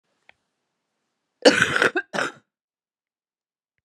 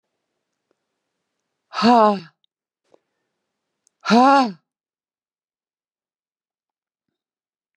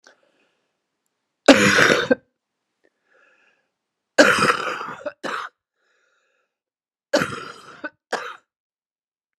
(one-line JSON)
{"cough_length": "3.8 s", "cough_amplitude": 30964, "cough_signal_mean_std_ratio": 0.27, "exhalation_length": "7.8 s", "exhalation_amplitude": 29172, "exhalation_signal_mean_std_ratio": 0.25, "three_cough_length": "9.4 s", "three_cough_amplitude": 32768, "three_cough_signal_mean_std_ratio": 0.3, "survey_phase": "beta (2021-08-13 to 2022-03-07)", "age": "65+", "gender": "Female", "wearing_mask": "No", "symptom_cough_any": true, "symptom_runny_or_blocked_nose": true, "symptom_sore_throat": true, "symptom_onset": "5 days", "smoker_status": "Ex-smoker", "respiratory_condition_asthma": false, "respiratory_condition_other": false, "recruitment_source": "Test and Trace", "submission_delay": "2 days", "covid_test_result": "Positive", "covid_test_method": "RT-qPCR"}